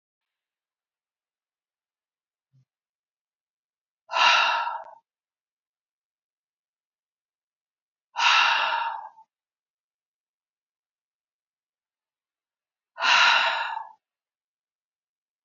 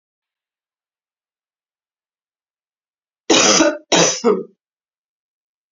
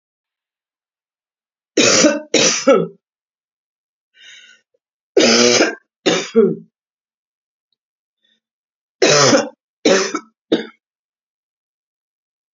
{"exhalation_length": "15.4 s", "exhalation_amplitude": 16208, "exhalation_signal_mean_std_ratio": 0.29, "cough_length": "5.7 s", "cough_amplitude": 32767, "cough_signal_mean_std_ratio": 0.31, "three_cough_length": "12.5 s", "three_cough_amplitude": 32767, "three_cough_signal_mean_std_ratio": 0.37, "survey_phase": "beta (2021-08-13 to 2022-03-07)", "age": "45-64", "gender": "Female", "wearing_mask": "No", "symptom_cough_any": true, "symptom_fatigue": true, "symptom_fever_high_temperature": true, "symptom_change_to_sense_of_smell_or_taste": true, "symptom_other": true, "symptom_onset": "3 days", "smoker_status": "Current smoker (e-cigarettes or vapes only)", "respiratory_condition_asthma": false, "respiratory_condition_other": false, "recruitment_source": "Test and Trace", "submission_delay": "2 days", "covid_test_result": "Positive", "covid_test_method": "RT-qPCR", "covid_ct_value": 19.7, "covid_ct_gene": "ORF1ab gene"}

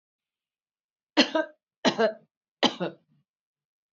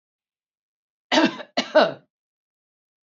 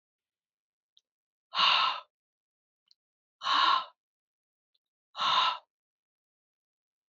{"three_cough_length": "3.9 s", "three_cough_amplitude": 22422, "three_cough_signal_mean_std_ratio": 0.29, "cough_length": "3.2 s", "cough_amplitude": 25215, "cough_signal_mean_std_ratio": 0.28, "exhalation_length": "7.1 s", "exhalation_amplitude": 8690, "exhalation_signal_mean_std_ratio": 0.33, "survey_phase": "beta (2021-08-13 to 2022-03-07)", "age": "65+", "gender": "Female", "wearing_mask": "No", "symptom_none": true, "symptom_onset": "13 days", "smoker_status": "Never smoked", "respiratory_condition_asthma": false, "respiratory_condition_other": false, "recruitment_source": "REACT", "submission_delay": "2 days", "covid_test_result": "Negative", "covid_test_method": "RT-qPCR"}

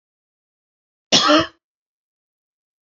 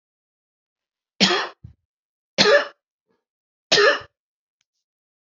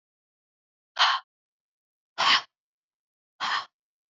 {"cough_length": "2.8 s", "cough_amplitude": 32767, "cough_signal_mean_std_ratio": 0.27, "three_cough_length": "5.2 s", "three_cough_amplitude": 32697, "three_cough_signal_mean_std_ratio": 0.3, "exhalation_length": "4.1 s", "exhalation_amplitude": 14548, "exhalation_signal_mean_std_ratio": 0.3, "survey_phase": "beta (2021-08-13 to 2022-03-07)", "age": "45-64", "gender": "Female", "wearing_mask": "No", "symptom_none": true, "smoker_status": "Never smoked", "respiratory_condition_asthma": false, "respiratory_condition_other": false, "recruitment_source": "REACT", "submission_delay": "1 day", "covid_test_result": "Negative", "covid_test_method": "RT-qPCR", "influenza_a_test_result": "Negative", "influenza_b_test_result": "Negative"}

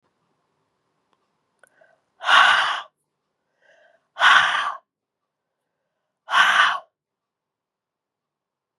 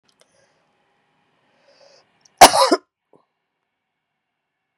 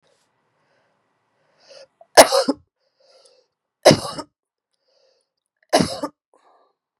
{"exhalation_length": "8.8 s", "exhalation_amplitude": 29137, "exhalation_signal_mean_std_ratio": 0.32, "cough_length": "4.8 s", "cough_amplitude": 32768, "cough_signal_mean_std_ratio": 0.18, "three_cough_length": "7.0 s", "three_cough_amplitude": 32768, "three_cough_signal_mean_std_ratio": 0.21, "survey_phase": "beta (2021-08-13 to 2022-03-07)", "age": "45-64", "gender": "Female", "wearing_mask": "No", "symptom_none": true, "smoker_status": "Ex-smoker", "respiratory_condition_asthma": false, "respiratory_condition_other": false, "recruitment_source": "REACT", "submission_delay": "1 day", "covid_test_result": "Negative", "covid_test_method": "RT-qPCR"}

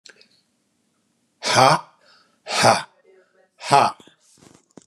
{"exhalation_length": "4.9 s", "exhalation_amplitude": 32588, "exhalation_signal_mean_std_ratio": 0.33, "survey_phase": "beta (2021-08-13 to 2022-03-07)", "age": "45-64", "gender": "Male", "wearing_mask": "No", "symptom_runny_or_blocked_nose": true, "symptom_sore_throat": true, "symptom_onset": "5 days", "smoker_status": "Never smoked", "respiratory_condition_asthma": false, "respiratory_condition_other": false, "recruitment_source": "REACT", "submission_delay": "2 days", "covid_test_result": "Negative", "covid_test_method": "RT-qPCR", "influenza_a_test_result": "Negative", "influenza_b_test_result": "Negative"}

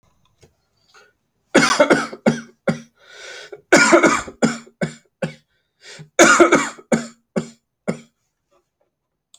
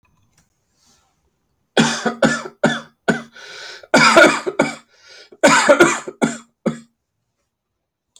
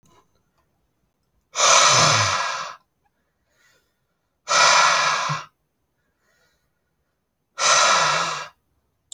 {"three_cough_length": "9.4 s", "three_cough_amplitude": 30605, "three_cough_signal_mean_std_ratio": 0.37, "cough_length": "8.2 s", "cough_amplitude": 32761, "cough_signal_mean_std_ratio": 0.4, "exhalation_length": "9.1 s", "exhalation_amplitude": 26138, "exhalation_signal_mean_std_ratio": 0.45, "survey_phase": "beta (2021-08-13 to 2022-03-07)", "age": "18-44", "gender": "Male", "wearing_mask": "No", "symptom_none": true, "smoker_status": "Never smoked", "respiratory_condition_asthma": false, "respiratory_condition_other": false, "recruitment_source": "Test and Trace", "submission_delay": "0 days", "covid_test_result": "Negative", "covid_test_method": "LFT"}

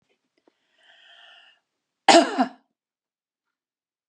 {"cough_length": "4.1 s", "cough_amplitude": 29131, "cough_signal_mean_std_ratio": 0.21, "survey_phase": "beta (2021-08-13 to 2022-03-07)", "age": "65+", "gender": "Female", "wearing_mask": "No", "symptom_runny_or_blocked_nose": true, "symptom_onset": "8 days", "smoker_status": "Never smoked", "respiratory_condition_asthma": false, "respiratory_condition_other": false, "recruitment_source": "REACT", "submission_delay": "3 days", "covid_test_result": "Negative", "covid_test_method": "RT-qPCR", "influenza_a_test_result": "Negative", "influenza_b_test_result": "Negative"}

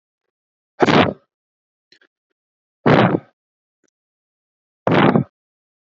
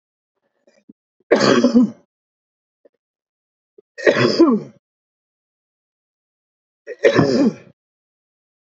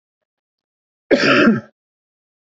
{"exhalation_length": "6.0 s", "exhalation_amplitude": 32767, "exhalation_signal_mean_std_ratio": 0.31, "three_cough_length": "8.7 s", "three_cough_amplitude": 29770, "three_cough_signal_mean_std_ratio": 0.34, "cough_length": "2.6 s", "cough_amplitude": 28175, "cough_signal_mean_std_ratio": 0.36, "survey_phase": "beta (2021-08-13 to 2022-03-07)", "age": "45-64", "gender": "Male", "wearing_mask": "No", "symptom_cough_any": true, "symptom_fatigue": true, "smoker_status": "Never smoked", "respiratory_condition_asthma": false, "respiratory_condition_other": false, "recruitment_source": "REACT", "submission_delay": "0 days", "covid_test_result": "Negative", "covid_test_method": "RT-qPCR", "influenza_a_test_result": "Negative", "influenza_b_test_result": "Negative"}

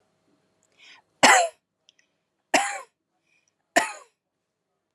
{"three_cough_length": "4.9 s", "three_cough_amplitude": 28273, "three_cough_signal_mean_std_ratio": 0.25, "survey_phase": "alpha (2021-03-01 to 2021-08-12)", "age": "45-64", "gender": "Female", "wearing_mask": "No", "symptom_none": true, "smoker_status": "Never smoked", "respiratory_condition_asthma": false, "respiratory_condition_other": false, "recruitment_source": "REACT", "submission_delay": "1 day", "covid_test_result": "Negative", "covid_test_method": "RT-qPCR"}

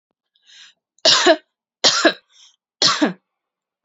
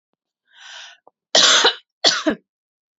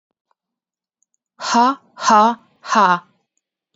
{"three_cough_length": "3.8 s", "three_cough_amplitude": 32356, "three_cough_signal_mean_std_ratio": 0.37, "cough_length": "3.0 s", "cough_amplitude": 32768, "cough_signal_mean_std_ratio": 0.37, "exhalation_length": "3.8 s", "exhalation_amplitude": 27648, "exhalation_signal_mean_std_ratio": 0.39, "survey_phase": "beta (2021-08-13 to 2022-03-07)", "age": "18-44", "gender": "Female", "wearing_mask": "No", "symptom_none": true, "smoker_status": "Never smoked", "respiratory_condition_asthma": false, "respiratory_condition_other": false, "recruitment_source": "REACT", "submission_delay": "1 day", "covid_test_result": "Negative", "covid_test_method": "RT-qPCR", "influenza_a_test_result": "Negative", "influenza_b_test_result": "Negative"}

